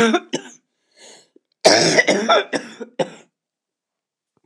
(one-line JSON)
{"cough_length": "4.5 s", "cough_amplitude": 29204, "cough_signal_mean_std_ratio": 0.41, "survey_phase": "beta (2021-08-13 to 2022-03-07)", "age": "65+", "gender": "Female", "wearing_mask": "No", "symptom_cough_any": true, "symptom_new_continuous_cough": true, "symptom_runny_or_blocked_nose": true, "symptom_fatigue": true, "symptom_headache": true, "symptom_change_to_sense_of_smell_or_taste": true, "symptom_loss_of_taste": true, "symptom_other": true, "symptom_onset": "6 days", "smoker_status": "Ex-smoker", "respiratory_condition_asthma": true, "respiratory_condition_other": false, "recruitment_source": "REACT", "submission_delay": "0 days", "covid_test_result": "Negative", "covid_test_method": "RT-qPCR", "influenza_a_test_result": "Negative", "influenza_b_test_result": "Negative"}